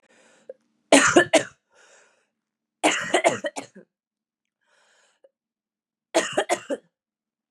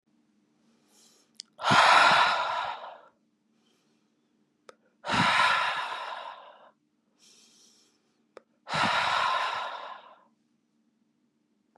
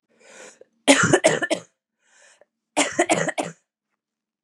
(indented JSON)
{
  "three_cough_length": "7.5 s",
  "three_cough_amplitude": 29170,
  "three_cough_signal_mean_std_ratio": 0.3,
  "exhalation_length": "11.8 s",
  "exhalation_amplitude": 14659,
  "exhalation_signal_mean_std_ratio": 0.41,
  "cough_length": "4.4 s",
  "cough_amplitude": 31899,
  "cough_signal_mean_std_ratio": 0.37,
  "survey_phase": "beta (2021-08-13 to 2022-03-07)",
  "age": "18-44",
  "gender": "Female",
  "wearing_mask": "No",
  "symptom_cough_any": true,
  "symptom_new_continuous_cough": true,
  "symptom_runny_or_blocked_nose": true,
  "symptom_sore_throat": true,
  "symptom_diarrhoea": true,
  "symptom_fatigue": true,
  "symptom_headache": true,
  "smoker_status": "Never smoked",
  "respiratory_condition_asthma": false,
  "respiratory_condition_other": false,
  "recruitment_source": "Test and Trace",
  "submission_delay": "2 days",
  "covid_test_result": "Positive",
  "covid_test_method": "LFT"
}